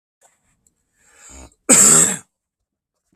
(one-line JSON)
{"cough_length": "3.2 s", "cough_amplitude": 32768, "cough_signal_mean_std_ratio": 0.31, "survey_phase": "beta (2021-08-13 to 2022-03-07)", "age": "65+", "gender": "Male", "wearing_mask": "No", "symptom_runny_or_blocked_nose": true, "symptom_onset": "12 days", "smoker_status": "Ex-smoker", "respiratory_condition_asthma": false, "respiratory_condition_other": true, "recruitment_source": "REACT", "submission_delay": "1 day", "covid_test_result": "Negative", "covid_test_method": "RT-qPCR", "influenza_a_test_result": "Negative", "influenza_b_test_result": "Negative"}